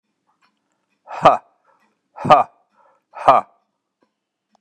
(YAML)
exhalation_length: 4.6 s
exhalation_amplitude: 32768
exhalation_signal_mean_std_ratio: 0.24
survey_phase: beta (2021-08-13 to 2022-03-07)
age: 65+
gender: Male
wearing_mask: 'No'
symptom_none: true
smoker_status: Never smoked
respiratory_condition_asthma: false
respiratory_condition_other: false
recruitment_source: REACT
submission_delay: 2 days
covid_test_result: Negative
covid_test_method: RT-qPCR
influenza_a_test_result: Negative
influenza_b_test_result: Negative